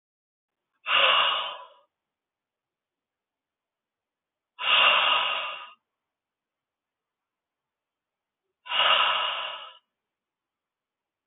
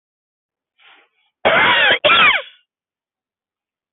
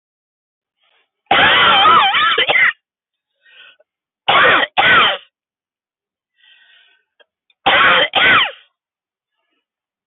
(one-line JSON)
{"exhalation_length": "11.3 s", "exhalation_amplitude": 12640, "exhalation_signal_mean_std_ratio": 0.37, "cough_length": "3.9 s", "cough_amplitude": 26673, "cough_signal_mean_std_ratio": 0.41, "three_cough_length": "10.1 s", "three_cough_amplitude": 29263, "three_cough_signal_mean_std_ratio": 0.48, "survey_phase": "beta (2021-08-13 to 2022-03-07)", "age": "65+", "gender": "Male", "wearing_mask": "No", "symptom_none": true, "smoker_status": "Never smoked", "respiratory_condition_asthma": false, "respiratory_condition_other": false, "recruitment_source": "REACT", "submission_delay": "2 days", "covid_test_result": "Negative", "covid_test_method": "RT-qPCR", "influenza_a_test_result": "Negative", "influenza_b_test_result": "Negative"}